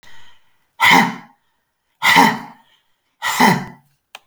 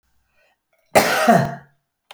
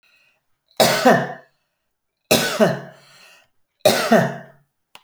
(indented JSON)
{
  "exhalation_length": "4.3 s",
  "exhalation_amplitude": 32767,
  "exhalation_signal_mean_std_ratio": 0.41,
  "cough_length": "2.1 s",
  "cough_amplitude": 32319,
  "cough_signal_mean_std_ratio": 0.4,
  "three_cough_length": "5.0 s",
  "three_cough_amplitude": 30492,
  "three_cough_signal_mean_std_ratio": 0.41,
  "survey_phase": "beta (2021-08-13 to 2022-03-07)",
  "age": "45-64",
  "gender": "Female",
  "wearing_mask": "No",
  "symptom_cough_any": true,
  "symptom_runny_or_blocked_nose": true,
  "symptom_sore_throat": true,
  "symptom_abdominal_pain": true,
  "symptom_fatigue": true,
  "symptom_headache": true,
  "smoker_status": "Never smoked",
  "respiratory_condition_asthma": false,
  "respiratory_condition_other": false,
  "recruitment_source": "Test and Trace",
  "submission_delay": "2 days",
  "covid_test_result": "Positive",
  "covid_test_method": "RT-qPCR",
  "covid_ct_value": 24.8,
  "covid_ct_gene": "ORF1ab gene",
  "covid_ct_mean": 25.5,
  "covid_viral_load": "4300 copies/ml",
  "covid_viral_load_category": "Minimal viral load (< 10K copies/ml)"
}